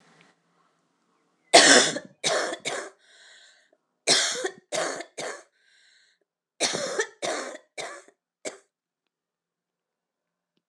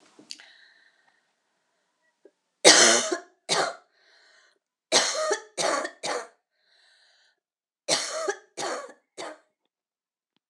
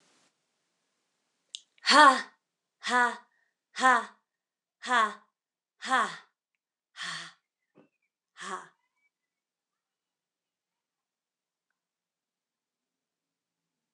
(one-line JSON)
{"cough_length": "10.7 s", "cough_amplitude": 26028, "cough_signal_mean_std_ratio": 0.31, "three_cough_length": "10.5 s", "three_cough_amplitude": 26020, "three_cough_signal_mean_std_ratio": 0.32, "exhalation_length": "13.9 s", "exhalation_amplitude": 17798, "exhalation_signal_mean_std_ratio": 0.23, "survey_phase": "alpha (2021-03-01 to 2021-08-12)", "age": "18-44", "gender": "Female", "wearing_mask": "No", "symptom_cough_any": true, "symptom_fatigue": true, "symptom_change_to_sense_of_smell_or_taste": true, "smoker_status": "Never smoked", "respiratory_condition_asthma": false, "respiratory_condition_other": false, "recruitment_source": "Test and Trace", "submission_delay": "2 days", "covid_test_result": "Positive", "covid_test_method": "RT-qPCR", "covid_ct_value": 28.4, "covid_ct_gene": "N gene"}